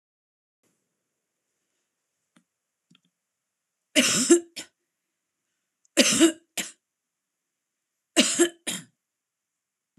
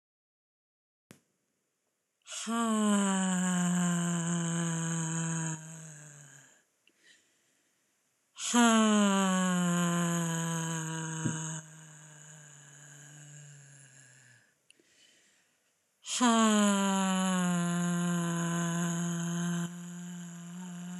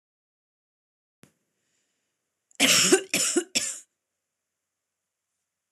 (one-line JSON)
{"three_cough_length": "10.0 s", "three_cough_amplitude": 24499, "three_cough_signal_mean_std_ratio": 0.26, "exhalation_length": "21.0 s", "exhalation_amplitude": 6906, "exhalation_signal_mean_std_ratio": 0.72, "cough_length": "5.7 s", "cough_amplitude": 18796, "cough_signal_mean_std_ratio": 0.29, "survey_phase": "beta (2021-08-13 to 2022-03-07)", "age": "45-64", "gender": "Female", "wearing_mask": "No", "symptom_none": true, "smoker_status": "Ex-smoker", "respiratory_condition_asthma": false, "respiratory_condition_other": false, "recruitment_source": "REACT", "submission_delay": "2 days", "covid_test_result": "Negative", "covid_test_method": "RT-qPCR"}